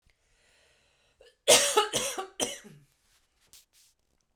{"cough_length": "4.4 s", "cough_amplitude": 17969, "cough_signal_mean_std_ratio": 0.3, "survey_phase": "beta (2021-08-13 to 2022-03-07)", "age": "45-64", "gender": "Female", "wearing_mask": "No", "symptom_none": true, "smoker_status": "Never smoked", "respiratory_condition_asthma": false, "respiratory_condition_other": false, "recruitment_source": "REACT", "submission_delay": "0 days", "covid_test_result": "Negative", "covid_test_method": "RT-qPCR"}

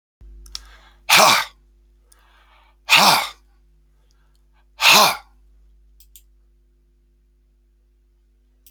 {"exhalation_length": "8.7 s", "exhalation_amplitude": 32768, "exhalation_signal_mean_std_ratio": 0.29, "survey_phase": "beta (2021-08-13 to 2022-03-07)", "age": "45-64", "gender": "Male", "wearing_mask": "No", "symptom_runny_or_blocked_nose": true, "symptom_sore_throat": true, "symptom_headache": true, "symptom_other": true, "smoker_status": "Current smoker (11 or more cigarettes per day)", "respiratory_condition_asthma": false, "respiratory_condition_other": false, "recruitment_source": "Test and Trace", "submission_delay": "2 days", "covid_test_result": "Positive", "covid_test_method": "RT-qPCR", "covid_ct_value": 20.7, "covid_ct_gene": "ORF1ab gene", "covid_ct_mean": 20.9, "covid_viral_load": "140000 copies/ml", "covid_viral_load_category": "Low viral load (10K-1M copies/ml)"}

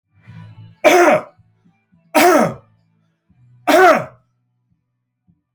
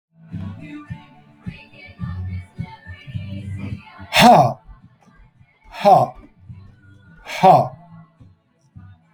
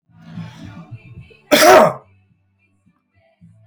{"three_cough_length": "5.5 s", "three_cough_amplitude": 30814, "three_cough_signal_mean_std_ratio": 0.38, "exhalation_length": "9.1 s", "exhalation_amplitude": 30137, "exhalation_signal_mean_std_ratio": 0.35, "cough_length": "3.7 s", "cough_amplitude": 31772, "cough_signal_mean_std_ratio": 0.31, "survey_phase": "alpha (2021-03-01 to 2021-08-12)", "age": "45-64", "gender": "Male", "wearing_mask": "No", "symptom_none": true, "smoker_status": "Current smoker (e-cigarettes or vapes only)", "respiratory_condition_asthma": false, "respiratory_condition_other": false, "recruitment_source": "REACT", "submission_delay": "2 days", "covid_test_result": "Negative", "covid_test_method": "RT-qPCR"}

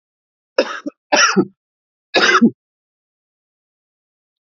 {"three_cough_length": "4.5 s", "three_cough_amplitude": 30442, "three_cough_signal_mean_std_ratio": 0.33, "survey_phase": "beta (2021-08-13 to 2022-03-07)", "age": "45-64", "gender": "Male", "wearing_mask": "No", "symptom_cough_any": true, "symptom_runny_or_blocked_nose": true, "symptom_sore_throat": true, "symptom_diarrhoea": true, "symptom_fatigue": true, "symptom_fever_high_temperature": true, "symptom_loss_of_taste": true, "symptom_onset": "4 days", "smoker_status": "Current smoker (e-cigarettes or vapes only)", "respiratory_condition_asthma": false, "respiratory_condition_other": false, "recruitment_source": "Test and Trace", "submission_delay": "1 day", "covid_test_result": "Positive", "covid_test_method": "RT-qPCR", "covid_ct_value": 14.3, "covid_ct_gene": "ORF1ab gene", "covid_ct_mean": 14.7, "covid_viral_load": "15000000 copies/ml", "covid_viral_load_category": "High viral load (>1M copies/ml)"}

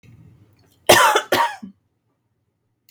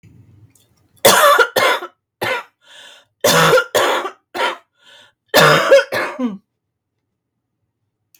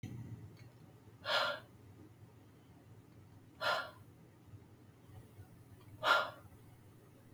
{"cough_length": "2.9 s", "cough_amplitude": 32768, "cough_signal_mean_std_ratio": 0.34, "three_cough_length": "8.2 s", "three_cough_amplitude": 32766, "three_cough_signal_mean_std_ratio": 0.47, "exhalation_length": "7.3 s", "exhalation_amplitude": 4544, "exhalation_signal_mean_std_ratio": 0.4, "survey_phase": "beta (2021-08-13 to 2022-03-07)", "age": "45-64", "gender": "Female", "wearing_mask": "No", "symptom_cough_any": true, "symptom_runny_or_blocked_nose": true, "symptom_fatigue": true, "symptom_onset": "13 days", "smoker_status": "Never smoked", "respiratory_condition_asthma": false, "respiratory_condition_other": false, "recruitment_source": "REACT", "submission_delay": "0 days", "covid_test_result": "Negative", "covid_test_method": "RT-qPCR"}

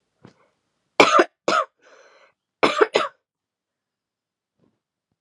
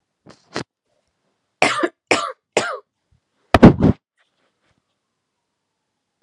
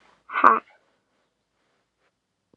{"cough_length": "5.2 s", "cough_amplitude": 32768, "cough_signal_mean_std_ratio": 0.27, "three_cough_length": "6.2 s", "three_cough_amplitude": 32768, "three_cough_signal_mean_std_ratio": 0.24, "exhalation_length": "2.6 s", "exhalation_amplitude": 31404, "exhalation_signal_mean_std_ratio": 0.2, "survey_phase": "alpha (2021-03-01 to 2021-08-12)", "age": "18-44", "gender": "Female", "wearing_mask": "No", "symptom_cough_any": true, "symptom_new_continuous_cough": true, "symptom_shortness_of_breath": true, "symptom_abdominal_pain": true, "symptom_diarrhoea": true, "symptom_fatigue": true, "symptom_fever_high_temperature": true, "symptom_headache": true, "symptom_onset": "6 days", "smoker_status": "Ex-smoker", "respiratory_condition_asthma": false, "respiratory_condition_other": false, "recruitment_source": "Test and Trace", "submission_delay": "3 days", "covid_test_result": "Positive", "covid_test_method": "RT-qPCR"}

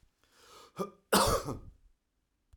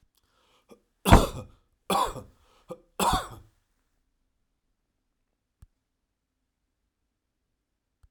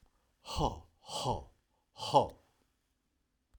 {"cough_length": "2.6 s", "cough_amplitude": 8674, "cough_signal_mean_std_ratio": 0.35, "three_cough_length": "8.1 s", "three_cough_amplitude": 31687, "three_cough_signal_mean_std_ratio": 0.2, "exhalation_length": "3.6 s", "exhalation_amplitude": 8311, "exhalation_signal_mean_std_ratio": 0.33, "survey_phase": "alpha (2021-03-01 to 2021-08-12)", "age": "45-64", "gender": "Male", "wearing_mask": "No", "symptom_none": true, "smoker_status": "Never smoked", "respiratory_condition_asthma": false, "respiratory_condition_other": false, "recruitment_source": "REACT", "submission_delay": "1 day", "covid_test_result": "Negative", "covid_test_method": "RT-qPCR"}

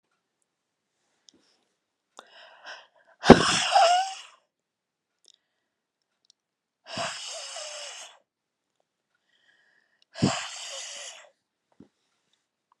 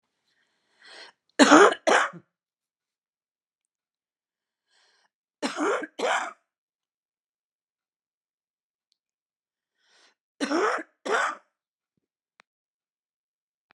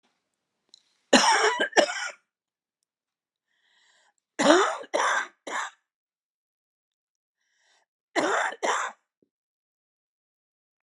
{"exhalation_length": "12.8 s", "exhalation_amplitude": 32768, "exhalation_signal_mean_std_ratio": 0.22, "three_cough_length": "13.7 s", "three_cough_amplitude": 30110, "three_cough_signal_mean_std_ratio": 0.24, "cough_length": "10.8 s", "cough_amplitude": 28299, "cough_signal_mean_std_ratio": 0.34, "survey_phase": "alpha (2021-03-01 to 2021-08-12)", "age": "65+", "gender": "Female", "wearing_mask": "No", "symptom_cough_any": true, "symptom_new_continuous_cough": true, "symptom_headache": true, "smoker_status": "Ex-smoker", "respiratory_condition_asthma": false, "respiratory_condition_other": false, "recruitment_source": "REACT", "submission_delay": "6 days", "covid_test_result": "Negative", "covid_test_method": "RT-qPCR"}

